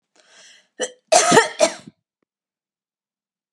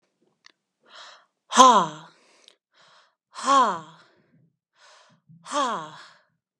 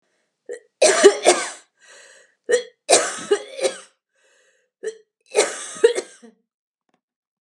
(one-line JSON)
{"cough_length": "3.5 s", "cough_amplitude": 32767, "cough_signal_mean_std_ratio": 0.3, "exhalation_length": "6.6 s", "exhalation_amplitude": 32768, "exhalation_signal_mean_std_ratio": 0.29, "three_cough_length": "7.4 s", "three_cough_amplitude": 32761, "three_cough_signal_mean_std_ratio": 0.35, "survey_phase": "beta (2021-08-13 to 2022-03-07)", "age": "18-44", "gender": "Female", "wearing_mask": "No", "symptom_none": true, "smoker_status": "Never smoked", "respiratory_condition_asthma": false, "respiratory_condition_other": false, "recruitment_source": "REACT", "submission_delay": "5 days", "covid_test_result": "Negative", "covid_test_method": "RT-qPCR", "influenza_a_test_result": "Negative", "influenza_b_test_result": "Negative"}